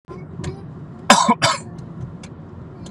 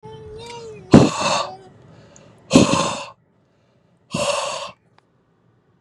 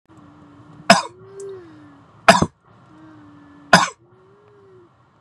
cough_length: 2.9 s
cough_amplitude: 32768
cough_signal_mean_std_ratio: 0.45
exhalation_length: 5.8 s
exhalation_amplitude: 32768
exhalation_signal_mean_std_ratio: 0.36
three_cough_length: 5.2 s
three_cough_amplitude: 32768
three_cough_signal_mean_std_ratio: 0.24
survey_phase: beta (2021-08-13 to 2022-03-07)
age: 18-44
gender: Male
wearing_mask: 'No'
symptom_runny_or_blocked_nose: true
symptom_onset: 9 days
smoker_status: Never smoked
respiratory_condition_asthma: false
respiratory_condition_other: false
recruitment_source: REACT
submission_delay: 5 days
covid_test_result: Negative
covid_test_method: RT-qPCR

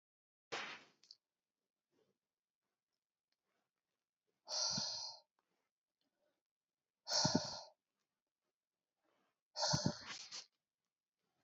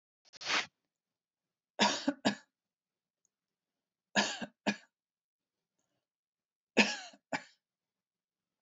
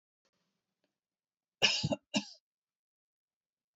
exhalation_length: 11.4 s
exhalation_amplitude: 3487
exhalation_signal_mean_std_ratio: 0.3
three_cough_length: 8.6 s
three_cough_amplitude: 8327
three_cough_signal_mean_std_ratio: 0.26
cough_length: 3.8 s
cough_amplitude: 7688
cough_signal_mean_std_ratio: 0.24
survey_phase: alpha (2021-03-01 to 2021-08-12)
age: 65+
gender: Female
wearing_mask: 'No'
symptom_none: true
smoker_status: Ex-smoker
respiratory_condition_asthma: false
respiratory_condition_other: false
recruitment_source: REACT
submission_delay: 14 days
covid_test_result: Negative
covid_test_method: RT-qPCR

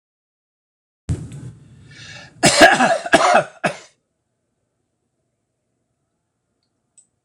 cough_length: 7.2 s
cough_amplitude: 26028
cough_signal_mean_std_ratio: 0.31
survey_phase: alpha (2021-03-01 to 2021-08-12)
age: 65+
gender: Male
wearing_mask: 'No'
symptom_none: true
smoker_status: Never smoked
respiratory_condition_asthma: false
respiratory_condition_other: false
recruitment_source: REACT
submission_delay: 2 days
covid_test_result: Negative
covid_test_method: RT-qPCR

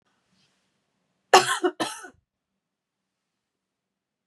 cough_length: 4.3 s
cough_amplitude: 30435
cough_signal_mean_std_ratio: 0.2
survey_phase: beta (2021-08-13 to 2022-03-07)
age: 45-64
gender: Female
wearing_mask: 'No'
symptom_none: true
smoker_status: Never smoked
respiratory_condition_asthma: false
respiratory_condition_other: false
recruitment_source: REACT
submission_delay: 2 days
covid_test_result: Negative
covid_test_method: RT-qPCR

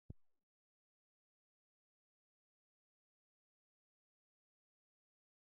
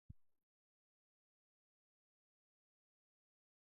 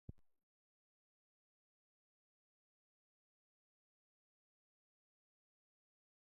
exhalation_length: 5.5 s
exhalation_amplitude: 357
exhalation_signal_mean_std_ratio: 0.11
cough_length: 3.8 s
cough_amplitude: 188
cough_signal_mean_std_ratio: 0.16
three_cough_length: 6.2 s
three_cough_amplitude: 372
three_cough_signal_mean_std_ratio: 0.1
survey_phase: beta (2021-08-13 to 2022-03-07)
age: 45-64
gender: Male
wearing_mask: 'No'
symptom_none: true
smoker_status: Ex-smoker
respiratory_condition_asthma: false
respiratory_condition_other: false
recruitment_source: REACT
submission_delay: 7 days
covid_test_result: Negative
covid_test_method: RT-qPCR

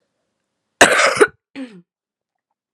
cough_length: 2.7 s
cough_amplitude: 32768
cough_signal_mean_std_ratio: 0.31
survey_phase: beta (2021-08-13 to 2022-03-07)
age: 18-44
gender: Female
wearing_mask: 'No'
symptom_cough_any: true
symptom_new_continuous_cough: true
symptom_runny_or_blocked_nose: true
symptom_shortness_of_breath: true
symptom_fatigue: true
symptom_headache: true
symptom_change_to_sense_of_smell_or_taste: true
symptom_onset: 5 days
smoker_status: Never smoked
respiratory_condition_asthma: false
respiratory_condition_other: false
recruitment_source: Test and Trace
submission_delay: 1 day
covid_test_result: Positive
covid_test_method: RT-qPCR
covid_ct_value: 19.8
covid_ct_gene: ORF1ab gene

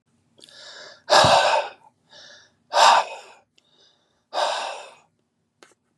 exhalation_length: 6.0 s
exhalation_amplitude: 31378
exhalation_signal_mean_std_ratio: 0.37
survey_phase: beta (2021-08-13 to 2022-03-07)
age: 18-44
gender: Male
wearing_mask: 'No'
symptom_none: true
smoker_status: Ex-smoker
respiratory_condition_asthma: false
respiratory_condition_other: false
recruitment_source: REACT
submission_delay: 3 days
covid_test_result: Negative
covid_test_method: RT-qPCR
influenza_a_test_result: Negative
influenza_b_test_result: Negative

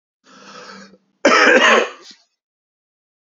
cough_length: 3.2 s
cough_amplitude: 29787
cough_signal_mean_std_ratio: 0.38
survey_phase: beta (2021-08-13 to 2022-03-07)
age: 45-64
gender: Male
wearing_mask: 'No'
symptom_none: true
smoker_status: Never smoked
respiratory_condition_asthma: false
respiratory_condition_other: false
recruitment_source: REACT
submission_delay: 2 days
covid_test_result: Negative
covid_test_method: RT-qPCR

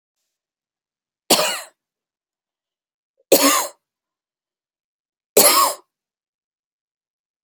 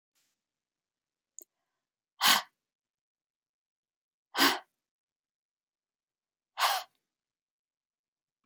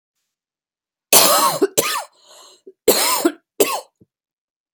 three_cough_length: 7.4 s
three_cough_amplitude: 32768
three_cough_signal_mean_std_ratio: 0.27
exhalation_length: 8.5 s
exhalation_amplitude: 10012
exhalation_signal_mean_std_ratio: 0.2
cough_length: 4.7 s
cough_amplitude: 32768
cough_signal_mean_std_ratio: 0.41
survey_phase: beta (2021-08-13 to 2022-03-07)
age: 45-64
gender: Female
wearing_mask: 'No'
symptom_none: true
symptom_onset: 4 days
smoker_status: Never smoked
respiratory_condition_asthma: false
respiratory_condition_other: false
recruitment_source: REACT
submission_delay: 1 day
covid_test_result: Negative
covid_test_method: RT-qPCR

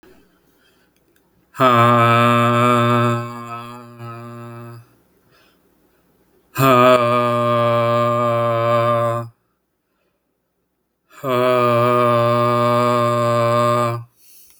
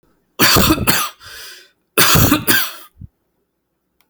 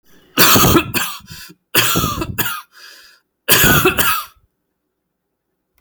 exhalation_length: 14.6 s
exhalation_amplitude: 30148
exhalation_signal_mean_std_ratio: 0.65
cough_length: 4.1 s
cough_amplitude: 32768
cough_signal_mean_std_ratio: 0.48
three_cough_length: 5.8 s
three_cough_amplitude: 32768
three_cough_signal_mean_std_ratio: 0.49
survey_phase: alpha (2021-03-01 to 2021-08-12)
age: 18-44
gender: Male
wearing_mask: 'No'
symptom_none: true
smoker_status: Never smoked
respiratory_condition_asthma: false
respiratory_condition_other: false
recruitment_source: REACT
submission_delay: 1 day
covid_test_result: Negative
covid_test_method: RT-qPCR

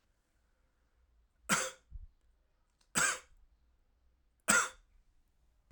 three_cough_length: 5.7 s
three_cough_amplitude: 9211
three_cough_signal_mean_std_ratio: 0.27
survey_phase: alpha (2021-03-01 to 2021-08-12)
age: 45-64
gender: Male
wearing_mask: 'No'
symptom_fatigue: true
symptom_fever_high_temperature: true
symptom_headache: true
symptom_onset: 3 days
smoker_status: Never smoked
respiratory_condition_asthma: false
respiratory_condition_other: false
recruitment_source: Test and Trace
submission_delay: 0 days
covid_test_result: Positive
covid_test_method: RT-qPCR
covid_ct_value: 29.7
covid_ct_gene: ORF1ab gene
covid_ct_mean: 30.3
covid_viral_load: 110 copies/ml
covid_viral_load_category: Minimal viral load (< 10K copies/ml)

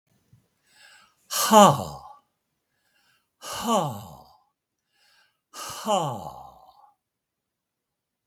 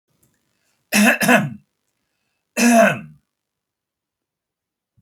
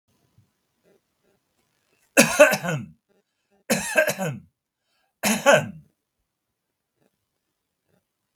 exhalation_length: 8.3 s
exhalation_amplitude: 32767
exhalation_signal_mean_std_ratio: 0.27
cough_length: 5.0 s
cough_amplitude: 32767
cough_signal_mean_std_ratio: 0.35
three_cough_length: 8.4 s
three_cough_amplitude: 32767
three_cough_signal_mean_std_ratio: 0.28
survey_phase: beta (2021-08-13 to 2022-03-07)
age: 65+
gender: Male
wearing_mask: 'No'
symptom_none: true
symptom_onset: 12 days
smoker_status: Never smoked
respiratory_condition_asthma: false
respiratory_condition_other: false
recruitment_source: REACT
submission_delay: 3 days
covid_test_result: Negative
covid_test_method: RT-qPCR
influenza_a_test_result: Negative
influenza_b_test_result: Negative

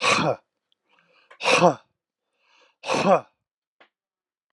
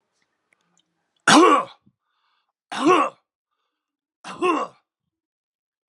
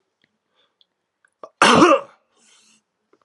exhalation_length: 4.5 s
exhalation_amplitude: 24847
exhalation_signal_mean_std_ratio: 0.35
three_cough_length: 5.9 s
three_cough_amplitude: 30334
three_cough_signal_mean_std_ratio: 0.3
cough_length: 3.2 s
cough_amplitude: 32384
cough_signal_mean_std_ratio: 0.28
survey_phase: alpha (2021-03-01 to 2021-08-12)
age: 65+
gender: Male
wearing_mask: 'No'
symptom_none: true
smoker_status: Never smoked
respiratory_condition_asthma: false
respiratory_condition_other: false
recruitment_source: REACT
submission_delay: 1 day
covid_test_result: Negative
covid_test_method: RT-qPCR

